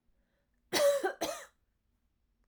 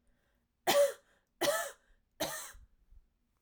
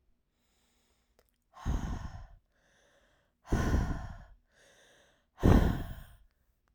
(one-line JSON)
{"cough_length": "2.5 s", "cough_amplitude": 4408, "cough_signal_mean_std_ratio": 0.38, "three_cough_length": "3.4 s", "three_cough_amplitude": 5120, "three_cough_signal_mean_std_ratio": 0.37, "exhalation_length": "6.7 s", "exhalation_amplitude": 10177, "exhalation_signal_mean_std_ratio": 0.34, "survey_phase": "alpha (2021-03-01 to 2021-08-12)", "age": "18-44", "gender": "Female", "wearing_mask": "No", "symptom_cough_any": true, "symptom_fatigue": true, "symptom_change_to_sense_of_smell_or_taste": true, "smoker_status": "Never smoked", "respiratory_condition_asthma": false, "respiratory_condition_other": false, "recruitment_source": "Test and Trace", "submission_delay": "1 day", "covid_test_result": "Positive", "covid_test_method": "RT-qPCR"}